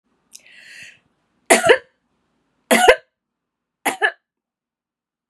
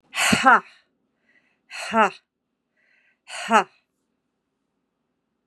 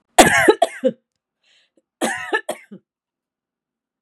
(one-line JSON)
{"three_cough_length": "5.3 s", "three_cough_amplitude": 32767, "three_cough_signal_mean_std_ratio": 0.27, "exhalation_length": "5.5 s", "exhalation_amplitude": 30286, "exhalation_signal_mean_std_ratio": 0.28, "cough_length": "4.0 s", "cough_amplitude": 32768, "cough_signal_mean_std_ratio": 0.32, "survey_phase": "beta (2021-08-13 to 2022-03-07)", "age": "45-64", "gender": "Female", "wearing_mask": "No", "symptom_none": true, "smoker_status": "Never smoked", "respiratory_condition_asthma": false, "respiratory_condition_other": false, "recruitment_source": "REACT", "submission_delay": "6 days", "covid_test_result": "Negative", "covid_test_method": "RT-qPCR", "influenza_a_test_result": "Negative", "influenza_b_test_result": "Negative"}